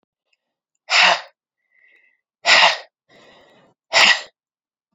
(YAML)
exhalation_length: 4.9 s
exhalation_amplitude: 31466
exhalation_signal_mean_std_ratio: 0.33
survey_phase: alpha (2021-03-01 to 2021-08-12)
age: 18-44
gender: Female
wearing_mask: 'No'
symptom_cough_any: true
symptom_new_continuous_cough: true
symptom_change_to_sense_of_smell_or_taste: true
symptom_loss_of_taste: true
smoker_status: Never smoked
respiratory_condition_asthma: false
respiratory_condition_other: false
recruitment_source: Test and Trace
submission_delay: 1 day
covid_test_result: Positive
covid_test_method: RT-qPCR
covid_ct_value: 28.9
covid_ct_gene: ORF1ab gene
covid_ct_mean: 30.1
covid_viral_load: 140 copies/ml
covid_viral_load_category: Minimal viral load (< 10K copies/ml)